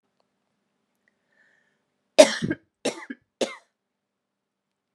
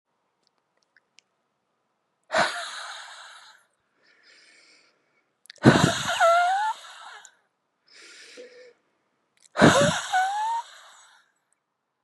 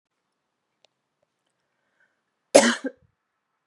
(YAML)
three_cough_length: 4.9 s
three_cough_amplitude: 32767
three_cough_signal_mean_std_ratio: 0.17
exhalation_length: 12.0 s
exhalation_amplitude: 28698
exhalation_signal_mean_std_ratio: 0.35
cough_length: 3.7 s
cough_amplitude: 32516
cough_signal_mean_std_ratio: 0.17
survey_phase: beta (2021-08-13 to 2022-03-07)
age: 18-44
gender: Female
wearing_mask: 'No'
symptom_cough_any: true
symptom_runny_or_blocked_nose: true
symptom_fatigue: true
symptom_headache: true
symptom_change_to_sense_of_smell_or_taste: true
symptom_loss_of_taste: true
symptom_onset: 2 days
smoker_status: Ex-smoker
respiratory_condition_asthma: false
respiratory_condition_other: false
recruitment_source: Test and Trace
submission_delay: 1 day
covid_test_result: Positive
covid_test_method: RT-qPCR
covid_ct_value: 14.6
covid_ct_gene: ORF1ab gene
covid_ct_mean: 14.9
covid_viral_load: 13000000 copies/ml
covid_viral_load_category: High viral load (>1M copies/ml)